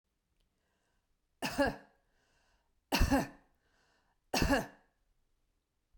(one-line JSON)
{"three_cough_length": "6.0 s", "three_cough_amplitude": 6071, "three_cough_signal_mean_std_ratio": 0.31, "survey_phase": "beta (2021-08-13 to 2022-03-07)", "age": "65+", "gender": "Female", "wearing_mask": "No", "symptom_none": true, "smoker_status": "Ex-smoker", "respiratory_condition_asthma": false, "respiratory_condition_other": false, "recruitment_source": "REACT", "submission_delay": "1 day", "covid_test_result": "Negative", "covid_test_method": "RT-qPCR", "covid_ct_value": 40.0, "covid_ct_gene": "N gene"}